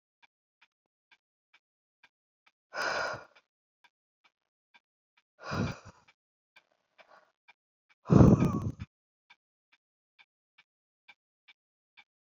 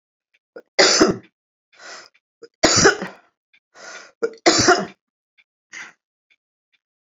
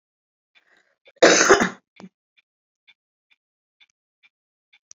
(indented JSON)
{
  "exhalation_length": "12.4 s",
  "exhalation_amplitude": 15021,
  "exhalation_signal_mean_std_ratio": 0.2,
  "three_cough_length": "7.1 s",
  "three_cough_amplitude": 30769,
  "three_cough_signal_mean_std_ratio": 0.33,
  "cough_length": "4.9 s",
  "cough_amplitude": 28414,
  "cough_signal_mean_std_ratio": 0.23,
  "survey_phase": "beta (2021-08-13 to 2022-03-07)",
  "age": "65+",
  "gender": "Female",
  "wearing_mask": "No",
  "symptom_fatigue": true,
  "smoker_status": "Current smoker (1 to 10 cigarettes per day)",
  "respiratory_condition_asthma": true,
  "respiratory_condition_other": false,
  "recruitment_source": "REACT",
  "submission_delay": "3 days",
  "covid_test_result": "Negative",
  "covid_test_method": "RT-qPCR"
}